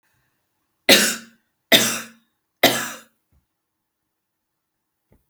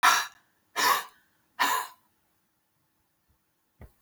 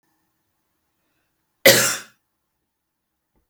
{"three_cough_length": "5.3 s", "three_cough_amplitude": 32329, "three_cough_signal_mean_std_ratio": 0.27, "exhalation_length": "4.0 s", "exhalation_amplitude": 13487, "exhalation_signal_mean_std_ratio": 0.34, "cough_length": "3.5 s", "cough_amplitude": 32768, "cough_signal_mean_std_ratio": 0.21, "survey_phase": "beta (2021-08-13 to 2022-03-07)", "age": "45-64", "gender": "Female", "wearing_mask": "No", "symptom_sore_throat": true, "symptom_onset": "12 days", "smoker_status": "Never smoked", "respiratory_condition_asthma": false, "respiratory_condition_other": false, "recruitment_source": "REACT", "submission_delay": "2 days", "covid_test_result": "Negative", "covid_test_method": "RT-qPCR"}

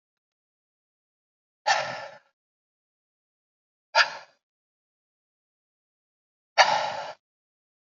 {"exhalation_length": "7.9 s", "exhalation_amplitude": 23200, "exhalation_signal_mean_std_ratio": 0.23, "survey_phase": "alpha (2021-03-01 to 2021-08-12)", "age": "18-44", "gender": "Male", "wearing_mask": "No", "symptom_cough_any": true, "symptom_headache": true, "symptom_onset": "2 days", "smoker_status": "Ex-smoker", "recruitment_source": "Test and Trace", "submission_delay": "1 day", "covid_test_result": "Positive", "covid_test_method": "RT-qPCR", "covid_ct_value": 15.2, "covid_ct_gene": "ORF1ab gene", "covid_ct_mean": 15.2, "covid_viral_load": "10000000 copies/ml", "covid_viral_load_category": "High viral load (>1M copies/ml)"}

